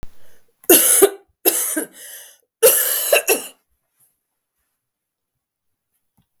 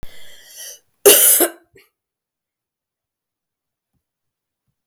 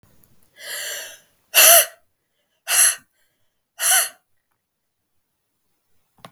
{"three_cough_length": "6.4 s", "three_cough_amplitude": 32768, "three_cough_signal_mean_std_ratio": 0.38, "cough_length": "4.9 s", "cough_amplitude": 32768, "cough_signal_mean_std_ratio": 0.26, "exhalation_length": "6.3 s", "exhalation_amplitude": 32768, "exhalation_signal_mean_std_ratio": 0.3, "survey_phase": "beta (2021-08-13 to 2022-03-07)", "age": "18-44", "gender": "Female", "wearing_mask": "No", "symptom_cough_any": true, "symptom_runny_or_blocked_nose": true, "symptom_shortness_of_breath": true, "symptom_fever_high_temperature": true, "symptom_headache": true, "symptom_change_to_sense_of_smell_or_taste": true, "symptom_loss_of_taste": true, "symptom_other": true, "symptom_onset": "4 days", "smoker_status": "Never smoked", "respiratory_condition_asthma": false, "respiratory_condition_other": false, "recruitment_source": "Test and Trace", "submission_delay": "2 days", "covid_test_result": "Positive", "covid_test_method": "RT-qPCR", "covid_ct_value": 21.6, "covid_ct_gene": "ORF1ab gene"}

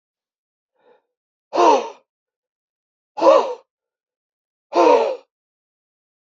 {"exhalation_length": "6.2 s", "exhalation_amplitude": 31510, "exhalation_signal_mean_std_ratio": 0.32, "survey_phase": "beta (2021-08-13 to 2022-03-07)", "age": "18-44", "gender": "Male", "wearing_mask": "No", "symptom_cough_any": true, "symptom_new_continuous_cough": true, "symptom_runny_or_blocked_nose": true, "symptom_shortness_of_breath": true, "symptom_fatigue": true, "symptom_headache": true, "symptom_onset": "4 days", "smoker_status": "Never smoked", "respiratory_condition_asthma": true, "respiratory_condition_other": false, "recruitment_source": "Test and Trace", "submission_delay": "2 days", "covid_test_result": "Positive", "covid_test_method": "ePCR"}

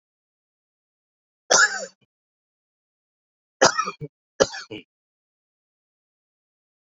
{"three_cough_length": "6.9 s", "three_cough_amplitude": 30861, "three_cough_signal_mean_std_ratio": 0.21, "survey_phase": "beta (2021-08-13 to 2022-03-07)", "age": "18-44", "gender": "Male", "wearing_mask": "No", "symptom_cough_any": true, "symptom_runny_or_blocked_nose": true, "symptom_shortness_of_breath": true, "symptom_sore_throat": true, "symptom_fatigue": true, "symptom_fever_high_temperature": true, "symptom_headache": true, "symptom_onset": "3 days", "smoker_status": "Current smoker (e-cigarettes or vapes only)", "respiratory_condition_asthma": false, "respiratory_condition_other": false, "recruitment_source": "Test and Trace", "submission_delay": "2 days", "covid_test_result": "Positive", "covid_test_method": "LAMP"}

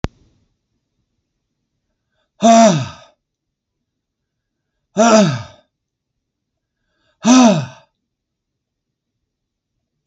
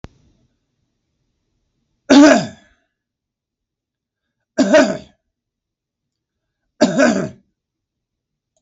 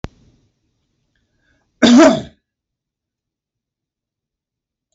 {"exhalation_length": "10.1 s", "exhalation_amplitude": 32768, "exhalation_signal_mean_std_ratio": 0.29, "three_cough_length": "8.6 s", "three_cough_amplitude": 32768, "three_cough_signal_mean_std_ratio": 0.28, "cough_length": "4.9 s", "cough_amplitude": 32768, "cough_signal_mean_std_ratio": 0.23, "survey_phase": "beta (2021-08-13 to 2022-03-07)", "age": "45-64", "gender": "Male", "wearing_mask": "No", "symptom_none": true, "smoker_status": "Never smoked", "respiratory_condition_asthma": true, "respiratory_condition_other": false, "recruitment_source": "REACT", "submission_delay": "4 days", "covid_test_result": "Negative", "covid_test_method": "RT-qPCR", "influenza_a_test_result": "Negative", "influenza_b_test_result": "Negative"}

